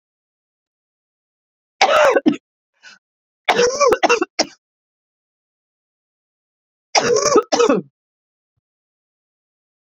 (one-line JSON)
{"three_cough_length": "10.0 s", "three_cough_amplitude": 32768, "three_cough_signal_mean_std_ratio": 0.35, "survey_phase": "beta (2021-08-13 to 2022-03-07)", "age": "45-64", "gender": "Female", "wearing_mask": "No", "symptom_cough_any": true, "symptom_new_continuous_cough": true, "symptom_runny_or_blocked_nose": true, "symptom_shortness_of_breath": true, "symptom_fatigue": true, "symptom_change_to_sense_of_smell_or_taste": true, "symptom_loss_of_taste": true, "symptom_onset": "5 days", "smoker_status": "Never smoked", "respiratory_condition_asthma": false, "respiratory_condition_other": false, "recruitment_source": "Test and Trace", "submission_delay": "2 days", "covid_test_result": "Positive", "covid_test_method": "RT-qPCR", "covid_ct_value": 15.2, "covid_ct_gene": "S gene", "covid_ct_mean": 15.6, "covid_viral_load": "7600000 copies/ml", "covid_viral_load_category": "High viral load (>1M copies/ml)"}